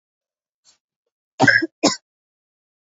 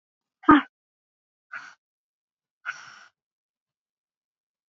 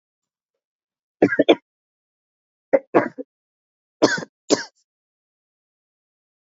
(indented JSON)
{
  "cough_length": "2.9 s",
  "cough_amplitude": 28635,
  "cough_signal_mean_std_ratio": 0.26,
  "exhalation_length": "4.7 s",
  "exhalation_amplitude": 22703,
  "exhalation_signal_mean_std_ratio": 0.15,
  "three_cough_length": "6.5 s",
  "three_cough_amplitude": 27768,
  "three_cough_signal_mean_std_ratio": 0.22,
  "survey_phase": "beta (2021-08-13 to 2022-03-07)",
  "age": "18-44",
  "gender": "Female",
  "wearing_mask": "No",
  "symptom_cough_any": true,
  "symptom_runny_or_blocked_nose": true,
  "symptom_sore_throat": true,
  "symptom_headache": true,
  "symptom_onset": "4 days",
  "smoker_status": "Never smoked",
  "respiratory_condition_asthma": true,
  "respiratory_condition_other": false,
  "recruitment_source": "Test and Trace",
  "submission_delay": "2 days",
  "covid_test_result": "Positive",
  "covid_test_method": "RT-qPCR",
  "covid_ct_value": 14.1,
  "covid_ct_gene": "N gene",
  "covid_ct_mean": 14.5,
  "covid_viral_load": "17000000 copies/ml",
  "covid_viral_load_category": "High viral load (>1M copies/ml)"
}